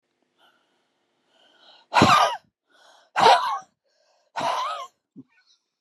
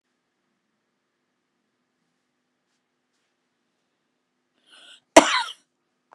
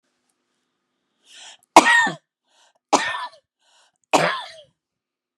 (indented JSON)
{
  "exhalation_length": "5.8 s",
  "exhalation_amplitude": 28147,
  "exhalation_signal_mean_std_ratio": 0.34,
  "cough_length": "6.1 s",
  "cough_amplitude": 32768,
  "cough_signal_mean_std_ratio": 0.12,
  "three_cough_length": "5.4 s",
  "three_cough_amplitude": 32768,
  "three_cough_signal_mean_std_ratio": 0.28,
  "survey_phase": "beta (2021-08-13 to 2022-03-07)",
  "age": "65+",
  "gender": "Female",
  "wearing_mask": "No",
  "symptom_shortness_of_breath": true,
  "smoker_status": "Ex-smoker",
  "respiratory_condition_asthma": false,
  "respiratory_condition_other": false,
  "recruitment_source": "REACT",
  "submission_delay": "1 day",
  "covid_test_result": "Negative",
  "covid_test_method": "RT-qPCR",
  "influenza_a_test_result": "Negative",
  "influenza_b_test_result": "Negative"
}